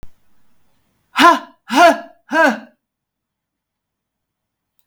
{"exhalation_length": "4.9 s", "exhalation_amplitude": 32768, "exhalation_signal_mean_std_ratio": 0.31, "survey_phase": "beta (2021-08-13 to 2022-03-07)", "age": "65+", "gender": "Female", "wearing_mask": "No", "symptom_none": true, "smoker_status": "Ex-smoker", "respiratory_condition_asthma": false, "respiratory_condition_other": false, "recruitment_source": "REACT", "submission_delay": "11 days", "covid_test_result": "Negative", "covid_test_method": "RT-qPCR", "influenza_a_test_result": "Negative", "influenza_b_test_result": "Negative"}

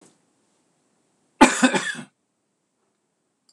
{"cough_length": "3.5 s", "cough_amplitude": 26028, "cough_signal_mean_std_ratio": 0.24, "survey_phase": "beta (2021-08-13 to 2022-03-07)", "age": "65+", "gender": "Male", "wearing_mask": "No", "symptom_none": true, "smoker_status": "Never smoked", "respiratory_condition_asthma": false, "respiratory_condition_other": false, "recruitment_source": "REACT", "submission_delay": "1 day", "covid_test_result": "Negative", "covid_test_method": "RT-qPCR"}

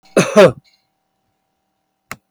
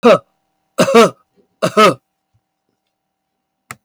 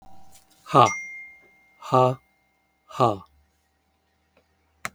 {"cough_length": "2.3 s", "cough_amplitude": 32768, "cough_signal_mean_std_ratio": 0.28, "three_cough_length": "3.8 s", "three_cough_amplitude": 32768, "three_cough_signal_mean_std_ratio": 0.35, "exhalation_length": "4.9 s", "exhalation_amplitude": 31188, "exhalation_signal_mean_std_ratio": 0.29, "survey_phase": "beta (2021-08-13 to 2022-03-07)", "age": "65+", "gender": "Male", "wearing_mask": "No", "symptom_none": true, "smoker_status": "Ex-smoker", "respiratory_condition_asthma": false, "respiratory_condition_other": false, "recruitment_source": "REACT", "submission_delay": "1 day", "covid_test_result": "Negative", "covid_test_method": "RT-qPCR"}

